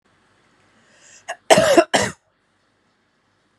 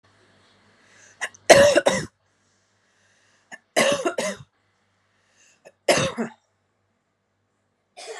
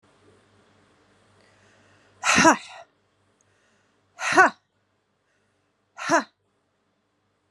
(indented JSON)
{
  "cough_length": "3.6 s",
  "cough_amplitude": 32768,
  "cough_signal_mean_std_ratio": 0.29,
  "three_cough_length": "8.2 s",
  "three_cough_amplitude": 32768,
  "three_cough_signal_mean_std_ratio": 0.29,
  "exhalation_length": "7.5 s",
  "exhalation_amplitude": 28458,
  "exhalation_signal_mean_std_ratio": 0.24,
  "survey_phase": "beta (2021-08-13 to 2022-03-07)",
  "age": "18-44",
  "gender": "Female",
  "wearing_mask": "No",
  "symptom_runny_or_blocked_nose": true,
  "symptom_fever_high_temperature": true,
  "symptom_change_to_sense_of_smell_or_taste": true,
  "symptom_onset": "2 days",
  "smoker_status": "Ex-smoker",
  "respiratory_condition_asthma": false,
  "respiratory_condition_other": false,
  "recruitment_source": "Test and Trace",
  "submission_delay": "2 days",
  "covid_test_result": "Positive",
  "covid_test_method": "ePCR"
}